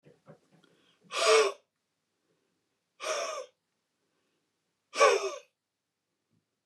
{
  "exhalation_length": "6.7 s",
  "exhalation_amplitude": 11633,
  "exhalation_signal_mean_std_ratio": 0.29,
  "survey_phase": "beta (2021-08-13 to 2022-03-07)",
  "age": "45-64",
  "gender": "Male",
  "wearing_mask": "No",
  "symptom_none": true,
  "smoker_status": "Never smoked",
  "respiratory_condition_asthma": false,
  "respiratory_condition_other": false,
  "recruitment_source": "Test and Trace",
  "submission_delay": "0 days",
  "covid_test_result": "Negative",
  "covid_test_method": "LFT"
}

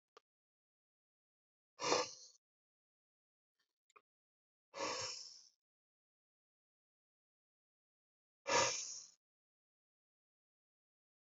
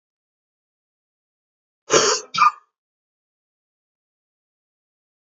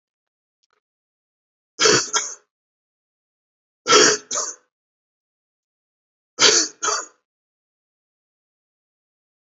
{
  "exhalation_length": "11.3 s",
  "exhalation_amplitude": 3540,
  "exhalation_signal_mean_std_ratio": 0.24,
  "cough_length": "5.3 s",
  "cough_amplitude": 28972,
  "cough_signal_mean_std_ratio": 0.22,
  "three_cough_length": "9.5 s",
  "three_cough_amplitude": 32023,
  "three_cough_signal_mean_std_ratio": 0.28,
  "survey_phase": "beta (2021-08-13 to 2022-03-07)",
  "age": "65+",
  "gender": "Male",
  "wearing_mask": "No",
  "symptom_none": true,
  "smoker_status": "Never smoked",
  "respiratory_condition_asthma": false,
  "respiratory_condition_other": false,
  "recruitment_source": "REACT",
  "submission_delay": "4 days",
  "covid_test_result": "Negative",
  "covid_test_method": "RT-qPCR"
}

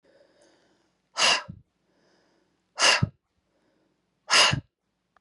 {
  "exhalation_length": "5.2 s",
  "exhalation_amplitude": 17068,
  "exhalation_signal_mean_std_ratio": 0.31,
  "survey_phase": "beta (2021-08-13 to 2022-03-07)",
  "age": "45-64",
  "gender": "Female",
  "wearing_mask": "No",
  "symptom_none": true,
  "symptom_onset": "8 days",
  "smoker_status": "Never smoked",
  "respiratory_condition_asthma": false,
  "respiratory_condition_other": false,
  "recruitment_source": "REACT",
  "submission_delay": "2 days",
  "covid_test_result": "Negative",
  "covid_test_method": "RT-qPCR",
  "influenza_a_test_result": "Negative",
  "influenza_b_test_result": "Negative"
}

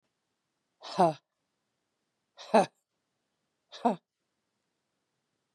{
  "exhalation_length": "5.5 s",
  "exhalation_amplitude": 11531,
  "exhalation_signal_mean_std_ratio": 0.2,
  "survey_phase": "beta (2021-08-13 to 2022-03-07)",
  "age": "45-64",
  "gender": "Female",
  "wearing_mask": "No",
  "symptom_cough_any": true,
  "symptom_runny_or_blocked_nose": true,
  "symptom_shortness_of_breath": true,
  "symptom_headache": true,
  "symptom_onset": "39 days",
  "smoker_status": "Current smoker (1 to 10 cigarettes per day)",
  "respiratory_condition_asthma": false,
  "respiratory_condition_other": false,
  "recruitment_source": "Test and Trace",
  "submission_delay": "2 days",
  "covid_test_result": "Negative",
  "covid_test_method": "ePCR"
}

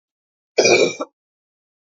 {
  "cough_length": "1.9 s",
  "cough_amplitude": 28568,
  "cough_signal_mean_std_ratio": 0.35,
  "survey_phase": "alpha (2021-03-01 to 2021-08-12)",
  "age": "45-64",
  "gender": "Female",
  "wearing_mask": "No",
  "symptom_cough_any": true,
  "symptom_fatigue": true,
  "symptom_fever_high_temperature": true,
  "symptom_headache": true,
  "symptom_onset": "3 days",
  "smoker_status": "Never smoked",
  "respiratory_condition_asthma": false,
  "respiratory_condition_other": false,
  "recruitment_source": "Test and Trace",
  "submission_delay": "1 day",
  "covid_test_result": "Positive",
  "covid_test_method": "RT-qPCR"
}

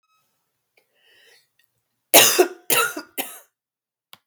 {
  "three_cough_length": "4.3 s",
  "three_cough_amplitude": 32768,
  "three_cough_signal_mean_std_ratio": 0.28,
  "survey_phase": "beta (2021-08-13 to 2022-03-07)",
  "age": "18-44",
  "gender": "Female",
  "wearing_mask": "No",
  "symptom_cough_any": true,
  "symptom_sore_throat": true,
  "symptom_fatigue": true,
  "smoker_status": "Never smoked",
  "respiratory_condition_asthma": false,
  "respiratory_condition_other": false,
  "recruitment_source": "Test and Trace",
  "submission_delay": "2 days",
  "covid_test_result": "Positive",
  "covid_test_method": "ePCR"
}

